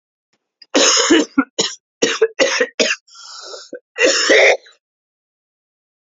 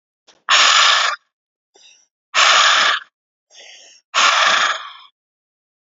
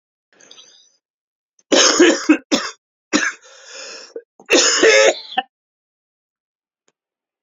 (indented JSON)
{
  "cough_length": "6.1 s",
  "cough_amplitude": 31435,
  "cough_signal_mean_std_ratio": 0.47,
  "exhalation_length": "5.9 s",
  "exhalation_amplitude": 32767,
  "exhalation_signal_mean_std_ratio": 0.5,
  "three_cough_length": "7.4 s",
  "three_cough_amplitude": 32768,
  "three_cough_signal_mean_std_ratio": 0.38,
  "survey_phase": "alpha (2021-03-01 to 2021-08-12)",
  "age": "45-64",
  "gender": "Male",
  "wearing_mask": "No",
  "symptom_cough_any": true,
  "symptom_change_to_sense_of_smell_or_taste": true,
  "symptom_loss_of_taste": true,
  "symptom_onset": "4 days",
  "smoker_status": "Never smoked",
  "respiratory_condition_asthma": false,
  "respiratory_condition_other": false,
  "recruitment_source": "Test and Trace",
  "submission_delay": "3 days",
  "covid_test_result": "Positive",
  "covid_test_method": "RT-qPCR",
  "covid_ct_value": 15.1,
  "covid_ct_gene": "ORF1ab gene",
  "covid_ct_mean": 15.6,
  "covid_viral_load": "7400000 copies/ml",
  "covid_viral_load_category": "High viral load (>1M copies/ml)"
}